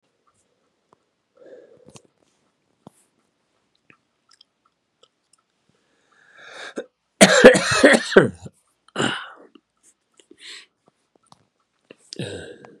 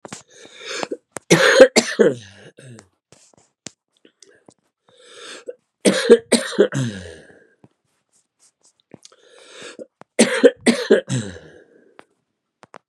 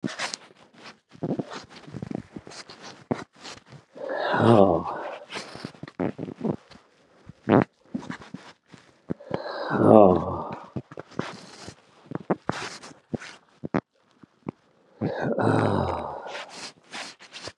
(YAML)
cough_length: 12.8 s
cough_amplitude: 32768
cough_signal_mean_std_ratio: 0.22
three_cough_length: 12.9 s
three_cough_amplitude: 32768
three_cough_signal_mean_std_ratio: 0.31
exhalation_length: 17.6 s
exhalation_amplitude: 28971
exhalation_signal_mean_std_ratio: 0.37
survey_phase: beta (2021-08-13 to 2022-03-07)
age: 65+
gender: Male
wearing_mask: 'No'
symptom_runny_or_blocked_nose: true
symptom_headache: true
smoker_status: Ex-smoker
respiratory_condition_asthma: true
respiratory_condition_other: false
recruitment_source: Test and Trace
submission_delay: 1 day
covid_test_result: Positive
covid_test_method: ePCR